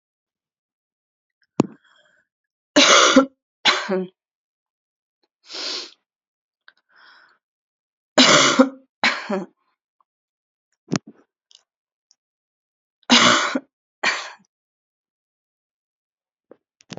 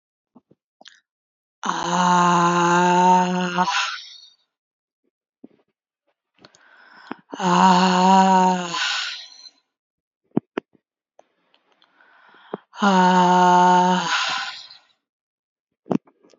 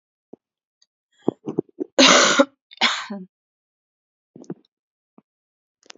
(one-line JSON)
{"three_cough_length": "17.0 s", "three_cough_amplitude": 30412, "three_cough_signal_mean_std_ratio": 0.28, "exhalation_length": "16.4 s", "exhalation_amplitude": 26204, "exhalation_signal_mean_std_ratio": 0.5, "cough_length": "6.0 s", "cough_amplitude": 28740, "cough_signal_mean_std_ratio": 0.28, "survey_phase": "beta (2021-08-13 to 2022-03-07)", "age": "18-44", "gender": "Female", "wearing_mask": "No", "symptom_cough_any": true, "symptom_runny_or_blocked_nose": true, "symptom_shortness_of_breath": true, "symptom_sore_throat": true, "symptom_headache": true, "smoker_status": "Ex-smoker", "respiratory_condition_asthma": false, "respiratory_condition_other": false, "recruitment_source": "Test and Trace", "submission_delay": "1 day", "covid_test_result": "Positive", "covid_test_method": "LFT"}